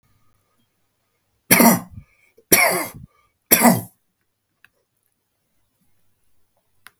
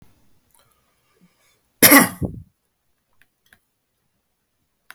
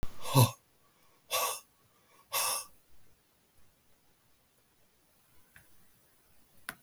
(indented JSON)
{
  "three_cough_length": "7.0 s",
  "three_cough_amplitude": 32768,
  "three_cough_signal_mean_std_ratio": 0.28,
  "cough_length": "4.9 s",
  "cough_amplitude": 32768,
  "cough_signal_mean_std_ratio": 0.2,
  "exhalation_length": "6.8 s",
  "exhalation_amplitude": 11190,
  "exhalation_signal_mean_std_ratio": 0.3,
  "survey_phase": "beta (2021-08-13 to 2022-03-07)",
  "age": "65+",
  "gender": "Male",
  "wearing_mask": "No",
  "symptom_cough_any": true,
  "smoker_status": "Ex-smoker",
  "respiratory_condition_asthma": false,
  "respiratory_condition_other": false,
  "recruitment_source": "REACT",
  "submission_delay": "3 days",
  "covid_test_result": "Negative",
  "covid_test_method": "RT-qPCR",
  "influenza_a_test_result": "Negative",
  "influenza_b_test_result": "Negative"
}